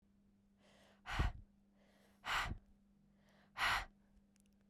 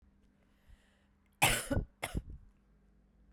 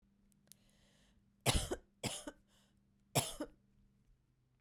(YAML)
exhalation_length: 4.7 s
exhalation_amplitude: 2102
exhalation_signal_mean_std_ratio: 0.38
cough_length: 3.3 s
cough_amplitude: 6823
cough_signal_mean_std_ratio: 0.32
three_cough_length: 4.6 s
three_cough_amplitude: 4353
three_cough_signal_mean_std_ratio: 0.29
survey_phase: beta (2021-08-13 to 2022-03-07)
age: 18-44
gender: Female
wearing_mask: 'No'
symptom_cough_any: true
symptom_runny_or_blocked_nose: true
symptom_sore_throat: true
symptom_abdominal_pain: true
symptom_fatigue: true
symptom_fever_high_temperature: true
symptom_headache: true
smoker_status: Never smoked
respiratory_condition_asthma: false
respiratory_condition_other: false
recruitment_source: Test and Trace
submission_delay: 1 day
covid_test_result: Positive
covid_test_method: RT-qPCR
covid_ct_value: 18.4
covid_ct_gene: ORF1ab gene